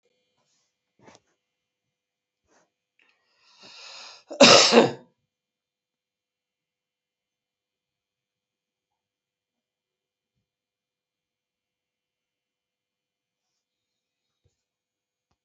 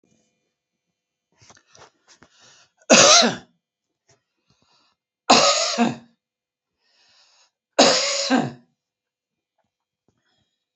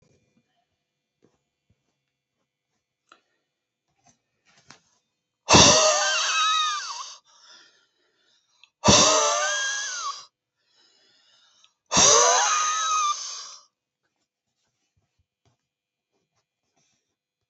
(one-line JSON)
{"cough_length": "15.4 s", "cough_amplitude": 30529, "cough_signal_mean_std_ratio": 0.14, "three_cough_length": "10.8 s", "three_cough_amplitude": 32768, "three_cough_signal_mean_std_ratio": 0.3, "exhalation_length": "17.5 s", "exhalation_amplitude": 26909, "exhalation_signal_mean_std_ratio": 0.36, "survey_phase": "alpha (2021-03-01 to 2021-08-12)", "age": "65+", "gender": "Male", "wearing_mask": "No", "symptom_none": true, "smoker_status": "Never smoked", "respiratory_condition_asthma": false, "respiratory_condition_other": false, "recruitment_source": "REACT", "submission_delay": "1 day", "covid_test_result": "Negative", "covid_test_method": "RT-qPCR"}